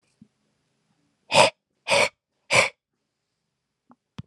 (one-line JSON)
{"exhalation_length": "4.3 s", "exhalation_amplitude": 26405, "exhalation_signal_mean_std_ratio": 0.28, "survey_phase": "alpha (2021-03-01 to 2021-08-12)", "age": "18-44", "gender": "Male", "wearing_mask": "No", "symptom_none": true, "smoker_status": "Never smoked", "respiratory_condition_asthma": false, "respiratory_condition_other": false, "recruitment_source": "REACT", "submission_delay": "1 day", "covid_test_result": "Negative", "covid_test_method": "RT-qPCR"}